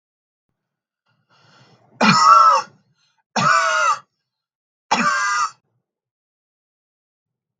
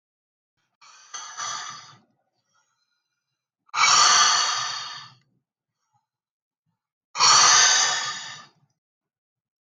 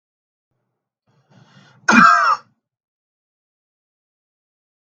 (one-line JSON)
{"three_cough_length": "7.6 s", "three_cough_amplitude": 32768, "three_cough_signal_mean_std_ratio": 0.39, "exhalation_length": "9.6 s", "exhalation_amplitude": 23524, "exhalation_signal_mean_std_ratio": 0.39, "cough_length": "4.9 s", "cough_amplitude": 32768, "cough_signal_mean_std_ratio": 0.25, "survey_phase": "beta (2021-08-13 to 2022-03-07)", "age": "18-44", "gender": "Male", "wearing_mask": "No", "symptom_none": true, "smoker_status": "Never smoked", "respiratory_condition_asthma": false, "respiratory_condition_other": false, "recruitment_source": "REACT", "submission_delay": "2 days", "covid_test_result": "Negative", "covid_test_method": "RT-qPCR", "influenza_a_test_result": "Negative", "influenza_b_test_result": "Negative"}